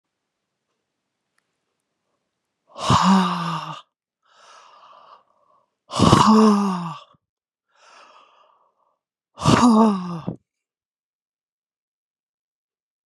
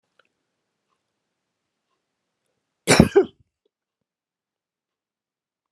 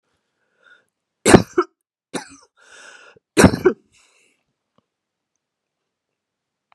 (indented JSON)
{
  "exhalation_length": "13.1 s",
  "exhalation_amplitude": 32768,
  "exhalation_signal_mean_std_ratio": 0.34,
  "cough_length": "5.7 s",
  "cough_amplitude": 32762,
  "cough_signal_mean_std_ratio": 0.16,
  "three_cough_length": "6.7 s",
  "three_cough_amplitude": 32768,
  "three_cough_signal_mean_std_ratio": 0.2,
  "survey_phase": "beta (2021-08-13 to 2022-03-07)",
  "age": "65+",
  "gender": "Female",
  "wearing_mask": "No",
  "symptom_none": true,
  "smoker_status": "Never smoked",
  "respiratory_condition_asthma": false,
  "respiratory_condition_other": false,
  "recruitment_source": "REACT",
  "submission_delay": "1 day",
  "covid_test_result": "Negative",
  "covid_test_method": "RT-qPCR"
}